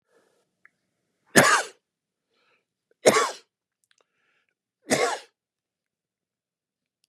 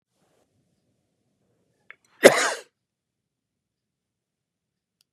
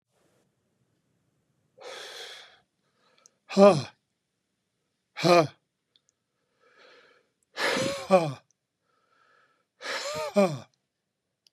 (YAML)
three_cough_length: 7.1 s
three_cough_amplitude: 29669
three_cough_signal_mean_std_ratio: 0.24
cough_length: 5.1 s
cough_amplitude: 32768
cough_signal_mean_std_ratio: 0.14
exhalation_length: 11.5 s
exhalation_amplitude: 19427
exhalation_signal_mean_std_ratio: 0.27
survey_phase: beta (2021-08-13 to 2022-03-07)
age: 65+
gender: Male
wearing_mask: 'No'
symptom_cough_any: true
symptom_runny_or_blocked_nose: true
smoker_status: Ex-smoker
recruitment_source: Test and Trace
submission_delay: 0 days
covid_test_result: Negative
covid_test_method: LFT